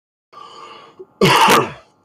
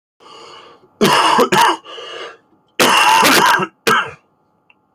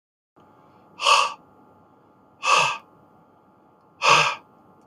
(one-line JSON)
{"cough_length": "2.0 s", "cough_amplitude": 32018, "cough_signal_mean_std_ratio": 0.44, "three_cough_length": "4.9 s", "three_cough_amplitude": 32768, "three_cough_signal_mean_std_ratio": 0.56, "exhalation_length": "4.9 s", "exhalation_amplitude": 21826, "exhalation_signal_mean_std_ratio": 0.36, "survey_phase": "beta (2021-08-13 to 2022-03-07)", "age": "18-44", "gender": "Male", "wearing_mask": "No", "symptom_cough_any": true, "symptom_runny_or_blocked_nose": true, "symptom_loss_of_taste": true, "symptom_onset": "7 days", "smoker_status": "Never smoked", "recruitment_source": "Test and Trace", "submission_delay": "2 days", "covid_test_result": "Positive", "covid_test_method": "RT-qPCR", "covid_ct_value": 16.8, "covid_ct_gene": "N gene", "covid_ct_mean": 17.1, "covid_viral_load": "2500000 copies/ml", "covid_viral_load_category": "High viral load (>1M copies/ml)"}